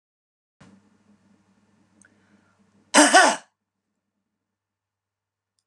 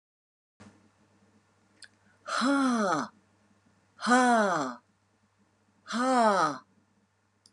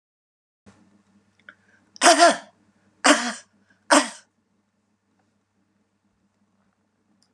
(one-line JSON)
{"cough_length": "5.7 s", "cough_amplitude": 30874, "cough_signal_mean_std_ratio": 0.21, "exhalation_length": "7.5 s", "exhalation_amplitude": 9961, "exhalation_signal_mean_std_ratio": 0.45, "three_cough_length": "7.3 s", "three_cough_amplitude": 29623, "three_cough_signal_mean_std_ratio": 0.24, "survey_phase": "beta (2021-08-13 to 2022-03-07)", "age": "65+", "gender": "Female", "wearing_mask": "No", "symptom_cough_any": true, "symptom_runny_or_blocked_nose": true, "symptom_sore_throat": true, "symptom_fatigue": true, "symptom_headache": true, "symptom_onset": "12 days", "smoker_status": "Never smoked", "respiratory_condition_asthma": false, "respiratory_condition_other": false, "recruitment_source": "REACT", "submission_delay": "5 days", "covid_test_result": "Negative", "covid_test_method": "RT-qPCR"}